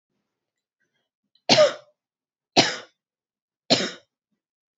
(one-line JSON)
{"three_cough_length": "4.8 s", "three_cough_amplitude": 31441, "three_cough_signal_mean_std_ratio": 0.26, "survey_phase": "beta (2021-08-13 to 2022-03-07)", "age": "18-44", "gender": "Female", "wearing_mask": "No", "symptom_none": true, "smoker_status": "Never smoked", "respiratory_condition_asthma": false, "respiratory_condition_other": false, "recruitment_source": "Test and Trace", "submission_delay": "0 days", "covid_test_result": "Negative", "covid_test_method": "LFT"}